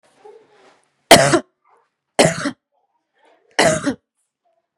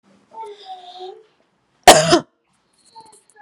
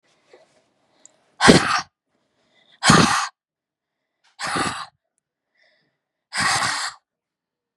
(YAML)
three_cough_length: 4.8 s
three_cough_amplitude: 32768
three_cough_signal_mean_std_ratio: 0.3
cough_length: 3.4 s
cough_amplitude: 32768
cough_signal_mean_std_ratio: 0.25
exhalation_length: 7.8 s
exhalation_amplitude: 32768
exhalation_signal_mean_std_ratio: 0.33
survey_phase: beta (2021-08-13 to 2022-03-07)
age: 18-44
gender: Female
wearing_mask: 'No'
symptom_none: true
smoker_status: Ex-smoker
respiratory_condition_asthma: false
respiratory_condition_other: false
recruitment_source: REACT
submission_delay: 6 days
covid_test_result: Negative
covid_test_method: RT-qPCR
influenza_a_test_result: Negative
influenza_b_test_result: Negative